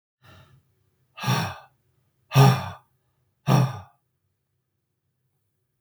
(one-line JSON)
{"exhalation_length": "5.8 s", "exhalation_amplitude": 23077, "exhalation_signal_mean_std_ratio": 0.29, "survey_phase": "beta (2021-08-13 to 2022-03-07)", "age": "45-64", "gender": "Male", "wearing_mask": "No", "symptom_none": true, "smoker_status": "Never smoked", "respiratory_condition_asthma": false, "respiratory_condition_other": false, "recruitment_source": "REACT", "submission_delay": "0 days", "covid_test_result": "Negative", "covid_test_method": "RT-qPCR", "influenza_a_test_result": "Negative", "influenza_b_test_result": "Negative"}